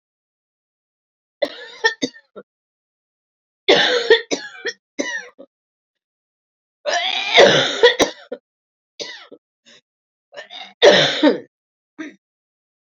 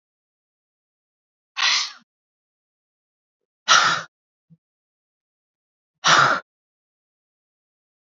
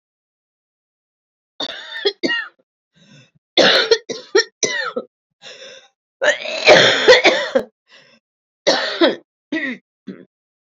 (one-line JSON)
{"three_cough_length": "13.0 s", "three_cough_amplitude": 31034, "three_cough_signal_mean_std_ratio": 0.34, "exhalation_length": "8.2 s", "exhalation_amplitude": 29745, "exhalation_signal_mean_std_ratio": 0.26, "cough_length": "10.8 s", "cough_amplitude": 30801, "cough_signal_mean_std_ratio": 0.4, "survey_phase": "beta (2021-08-13 to 2022-03-07)", "age": "45-64", "gender": "Female", "wearing_mask": "No", "symptom_cough_any": true, "symptom_runny_or_blocked_nose": true, "symptom_sore_throat": true, "symptom_abdominal_pain": true, "symptom_fatigue": true, "symptom_headache": true, "symptom_change_to_sense_of_smell_or_taste": true, "symptom_onset": "2 days", "smoker_status": "Never smoked", "respiratory_condition_asthma": false, "respiratory_condition_other": false, "recruitment_source": "Test and Trace", "submission_delay": "1 day", "covid_test_result": "Positive", "covid_test_method": "RT-qPCR", "covid_ct_value": 19.9, "covid_ct_gene": "N gene"}